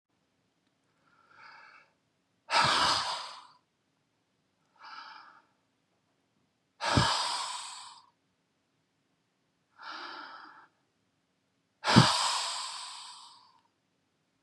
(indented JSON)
{
  "exhalation_length": "14.4 s",
  "exhalation_amplitude": 19153,
  "exhalation_signal_mean_std_ratio": 0.32,
  "survey_phase": "beta (2021-08-13 to 2022-03-07)",
  "age": "18-44",
  "gender": "Male",
  "wearing_mask": "No",
  "symptom_fatigue": true,
  "symptom_headache": true,
  "smoker_status": "Current smoker (1 to 10 cigarettes per day)",
  "respiratory_condition_asthma": false,
  "respiratory_condition_other": false,
  "recruitment_source": "REACT",
  "submission_delay": "2 days",
  "covid_test_result": "Negative",
  "covid_test_method": "RT-qPCR"
}